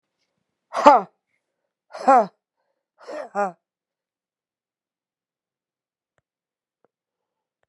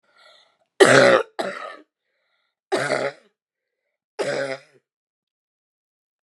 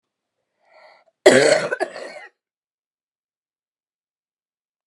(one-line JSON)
{"exhalation_length": "7.7 s", "exhalation_amplitude": 32768, "exhalation_signal_mean_std_ratio": 0.2, "three_cough_length": "6.2 s", "three_cough_amplitude": 32293, "three_cough_signal_mean_std_ratio": 0.31, "cough_length": "4.9 s", "cough_amplitude": 32767, "cough_signal_mean_std_ratio": 0.25, "survey_phase": "beta (2021-08-13 to 2022-03-07)", "age": "18-44", "gender": "Female", "wearing_mask": "No", "symptom_new_continuous_cough": true, "symptom_runny_or_blocked_nose": true, "symptom_shortness_of_breath": true, "symptom_fatigue": true, "symptom_fever_high_temperature": true, "symptom_headache": true, "symptom_change_to_sense_of_smell_or_taste": true, "symptom_loss_of_taste": true, "symptom_onset": "5 days", "smoker_status": "Never smoked", "respiratory_condition_asthma": true, "respiratory_condition_other": false, "recruitment_source": "Test and Trace", "submission_delay": "2 days", "covid_test_result": "Positive", "covid_test_method": "ePCR"}